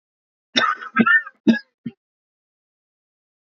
{"cough_length": "3.4 s", "cough_amplitude": 26029, "cough_signal_mean_std_ratio": 0.33, "survey_phase": "beta (2021-08-13 to 2022-03-07)", "age": "45-64", "gender": "Male", "wearing_mask": "No", "symptom_cough_any": true, "symptom_runny_or_blocked_nose": true, "symptom_shortness_of_breath": true, "symptom_sore_throat": true, "symptom_abdominal_pain": true, "symptom_diarrhoea": true, "symptom_fatigue": true, "symptom_change_to_sense_of_smell_or_taste": true, "symptom_onset": "12 days", "smoker_status": "Never smoked", "respiratory_condition_asthma": true, "respiratory_condition_other": false, "recruitment_source": "REACT", "submission_delay": "3 days", "covid_test_result": "Negative", "covid_test_method": "RT-qPCR"}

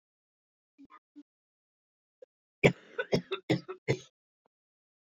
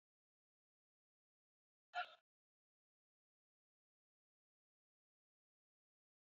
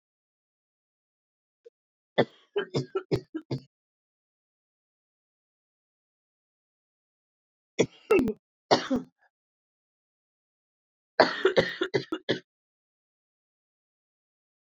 {"cough_length": "5.0 s", "cough_amplitude": 15974, "cough_signal_mean_std_ratio": 0.22, "exhalation_length": "6.4 s", "exhalation_amplitude": 635, "exhalation_signal_mean_std_ratio": 0.11, "three_cough_length": "14.8 s", "three_cough_amplitude": 23021, "three_cough_signal_mean_std_ratio": 0.24, "survey_phase": "beta (2021-08-13 to 2022-03-07)", "age": "18-44", "gender": "Female", "wearing_mask": "No", "symptom_new_continuous_cough": true, "symptom_runny_or_blocked_nose": true, "symptom_shortness_of_breath": true, "symptom_fatigue": true, "symptom_fever_high_temperature": true, "symptom_headache": true, "symptom_change_to_sense_of_smell_or_taste": true, "symptom_loss_of_taste": true, "symptom_onset": "3 days", "smoker_status": "Ex-smoker", "respiratory_condition_asthma": false, "respiratory_condition_other": false, "recruitment_source": "Test and Trace", "submission_delay": "2 days", "covid_test_result": "Positive", "covid_test_method": "RT-qPCR", "covid_ct_value": 13.2, "covid_ct_gene": "ORF1ab gene", "covid_ct_mean": 13.6, "covid_viral_load": "34000000 copies/ml", "covid_viral_load_category": "High viral load (>1M copies/ml)"}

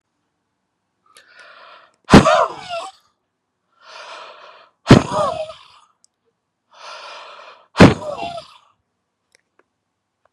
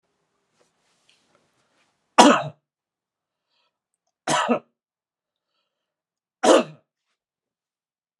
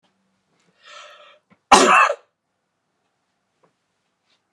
{"exhalation_length": "10.3 s", "exhalation_amplitude": 32768, "exhalation_signal_mean_std_ratio": 0.25, "three_cough_length": "8.2 s", "three_cough_amplitude": 32768, "three_cough_signal_mean_std_ratio": 0.22, "cough_length": "4.5 s", "cough_amplitude": 32768, "cough_signal_mean_std_ratio": 0.24, "survey_phase": "beta (2021-08-13 to 2022-03-07)", "age": "45-64", "gender": "Male", "wearing_mask": "No", "symptom_none": true, "smoker_status": "Never smoked", "respiratory_condition_asthma": false, "respiratory_condition_other": false, "recruitment_source": "REACT", "submission_delay": "1 day", "covid_test_result": "Negative", "covid_test_method": "RT-qPCR"}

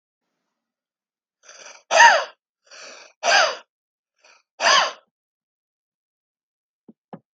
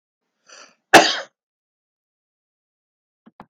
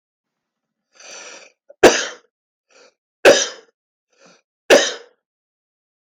{"exhalation_length": "7.3 s", "exhalation_amplitude": 32768, "exhalation_signal_mean_std_ratio": 0.27, "cough_length": "3.5 s", "cough_amplitude": 32768, "cough_signal_mean_std_ratio": 0.18, "three_cough_length": "6.1 s", "three_cough_amplitude": 32768, "three_cough_signal_mean_std_ratio": 0.25, "survey_phase": "beta (2021-08-13 to 2022-03-07)", "age": "65+", "gender": "Male", "wearing_mask": "No", "symptom_none": true, "smoker_status": "Never smoked", "respiratory_condition_asthma": true, "respiratory_condition_other": false, "recruitment_source": "REACT", "submission_delay": "2 days", "covid_test_result": "Negative", "covid_test_method": "RT-qPCR", "influenza_a_test_result": "Negative", "influenza_b_test_result": "Negative"}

